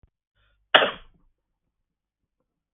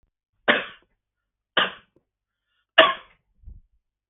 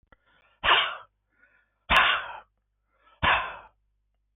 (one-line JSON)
{"cough_length": "2.7 s", "cough_amplitude": 32768, "cough_signal_mean_std_ratio": 0.17, "three_cough_length": "4.1 s", "three_cough_amplitude": 32767, "three_cough_signal_mean_std_ratio": 0.23, "exhalation_length": "4.4 s", "exhalation_amplitude": 15774, "exhalation_signal_mean_std_ratio": 0.37, "survey_phase": "beta (2021-08-13 to 2022-03-07)", "age": "45-64", "gender": "Male", "wearing_mask": "No", "symptom_none": true, "smoker_status": "Never smoked", "respiratory_condition_asthma": false, "respiratory_condition_other": false, "recruitment_source": "REACT", "submission_delay": "3 days", "covid_test_result": "Negative", "covid_test_method": "RT-qPCR", "influenza_a_test_result": "Negative", "influenza_b_test_result": "Negative"}